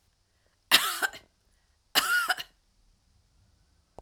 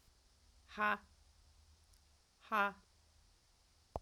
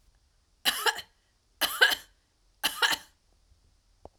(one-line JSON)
{"cough_length": "4.0 s", "cough_amplitude": 23595, "cough_signal_mean_std_ratio": 0.32, "exhalation_length": "4.0 s", "exhalation_amplitude": 2895, "exhalation_signal_mean_std_ratio": 0.29, "three_cough_length": "4.2 s", "three_cough_amplitude": 17321, "three_cough_signal_mean_std_ratio": 0.33, "survey_phase": "alpha (2021-03-01 to 2021-08-12)", "age": "65+", "gender": "Female", "wearing_mask": "No", "symptom_none": true, "smoker_status": "Never smoked", "respiratory_condition_asthma": false, "respiratory_condition_other": false, "recruitment_source": "REACT", "submission_delay": "3 days", "covid_test_result": "Negative", "covid_test_method": "RT-qPCR"}